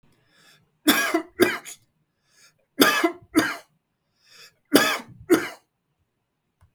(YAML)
three_cough_length: 6.7 s
three_cough_amplitude: 32768
three_cough_signal_mean_std_ratio: 0.35
survey_phase: beta (2021-08-13 to 2022-03-07)
age: 45-64
gender: Male
wearing_mask: 'No'
symptom_none: true
smoker_status: Never smoked
respiratory_condition_asthma: false
respiratory_condition_other: false
recruitment_source: REACT
submission_delay: 5 days
covid_test_result: Negative
covid_test_method: RT-qPCR
influenza_a_test_result: Negative
influenza_b_test_result: Negative